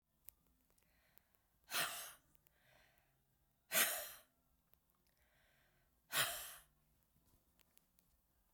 exhalation_length: 8.5 s
exhalation_amplitude: 2985
exhalation_signal_mean_std_ratio: 0.27
survey_phase: beta (2021-08-13 to 2022-03-07)
age: 65+
gender: Female
wearing_mask: 'No'
symptom_none: true
smoker_status: Never smoked
respiratory_condition_asthma: false
respiratory_condition_other: false
recruitment_source: REACT
submission_delay: 0 days
covid_test_result: Negative
covid_test_method: RT-qPCR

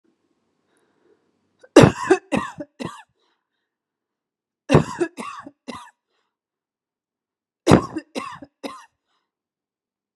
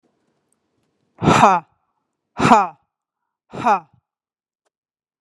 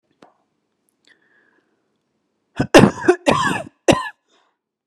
three_cough_length: 10.2 s
three_cough_amplitude: 32768
three_cough_signal_mean_std_ratio: 0.22
exhalation_length: 5.2 s
exhalation_amplitude: 32768
exhalation_signal_mean_std_ratio: 0.3
cough_length: 4.9 s
cough_amplitude: 32768
cough_signal_mean_std_ratio: 0.28
survey_phase: beta (2021-08-13 to 2022-03-07)
age: 18-44
gender: Female
wearing_mask: 'No'
symptom_headache: true
smoker_status: Never smoked
respiratory_condition_asthma: false
respiratory_condition_other: false
recruitment_source: Test and Trace
submission_delay: 0 days
covid_test_result: Negative
covid_test_method: LFT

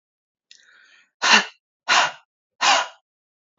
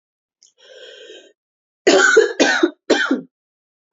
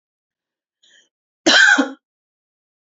exhalation_length: 3.6 s
exhalation_amplitude: 29332
exhalation_signal_mean_std_ratio: 0.34
three_cough_length: 3.9 s
three_cough_amplitude: 30802
three_cough_signal_mean_std_ratio: 0.42
cough_length: 3.0 s
cough_amplitude: 29331
cough_signal_mean_std_ratio: 0.3
survey_phase: beta (2021-08-13 to 2022-03-07)
age: 18-44
gender: Female
wearing_mask: 'No'
symptom_cough_any: true
symptom_runny_or_blocked_nose: true
symptom_sore_throat: true
symptom_headache: true
smoker_status: Never smoked
respiratory_condition_asthma: false
respiratory_condition_other: false
recruitment_source: Test and Trace
submission_delay: 1 day
covid_test_result: Positive
covid_test_method: ePCR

